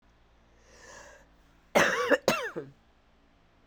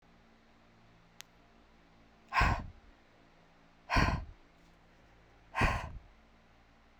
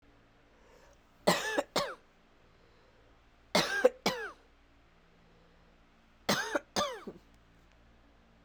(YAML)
cough_length: 3.7 s
cough_amplitude: 12551
cough_signal_mean_std_ratio: 0.34
exhalation_length: 7.0 s
exhalation_amplitude: 5950
exhalation_signal_mean_std_ratio: 0.33
three_cough_length: 8.4 s
three_cough_amplitude: 11707
three_cough_signal_mean_std_ratio: 0.33
survey_phase: beta (2021-08-13 to 2022-03-07)
age: 18-44
gender: Female
wearing_mask: 'No'
symptom_cough_any: true
symptom_runny_or_blocked_nose: true
symptom_sore_throat: true
symptom_abdominal_pain: true
symptom_fever_high_temperature: true
symptom_headache: true
symptom_other: true
symptom_onset: 3 days
smoker_status: Ex-smoker
respiratory_condition_asthma: false
respiratory_condition_other: false
recruitment_source: Test and Trace
submission_delay: 1 day
covid_test_result: Positive
covid_test_method: RT-qPCR
covid_ct_value: 15.3
covid_ct_gene: ORF1ab gene
covid_ct_mean: 15.6
covid_viral_load: 7600000 copies/ml
covid_viral_load_category: High viral load (>1M copies/ml)